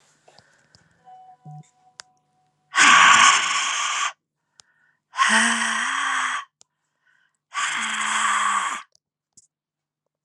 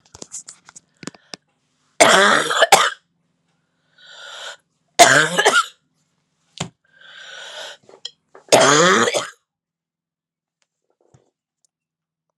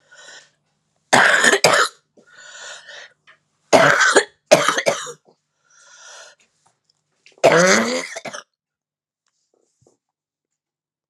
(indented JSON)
{
  "exhalation_length": "10.2 s",
  "exhalation_amplitude": 30922,
  "exhalation_signal_mean_std_ratio": 0.46,
  "three_cough_length": "12.4 s",
  "three_cough_amplitude": 32768,
  "three_cough_signal_mean_std_ratio": 0.33,
  "cough_length": "11.1 s",
  "cough_amplitude": 32768,
  "cough_signal_mean_std_ratio": 0.36,
  "survey_phase": "alpha (2021-03-01 to 2021-08-12)",
  "age": "45-64",
  "gender": "Female",
  "wearing_mask": "No",
  "symptom_cough_any": true,
  "symptom_new_continuous_cough": true,
  "symptom_shortness_of_breath": true,
  "symptom_fatigue": true,
  "symptom_headache": true,
  "symptom_change_to_sense_of_smell_or_taste": true,
  "symptom_loss_of_taste": true,
  "symptom_onset": "7 days",
  "smoker_status": "Never smoked",
  "respiratory_condition_asthma": false,
  "respiratory_condition_other": false,
  "recruitment_source": "Test and Trace",
  "submission_delay": "4 days",
  "covid_test_result": "Positive",
  "covid_test_method": "RT-qPCR",
  "covid_ct_value": 23.7,
  "covid_ct_gene": "ORF1ab gene",
  "covid_ct_mean": 24.0,
  "covid_viral_load": "13000 copies/ml",
  "covid_viral_load_category": "Low viral load (10K-1M copies/ml)"
}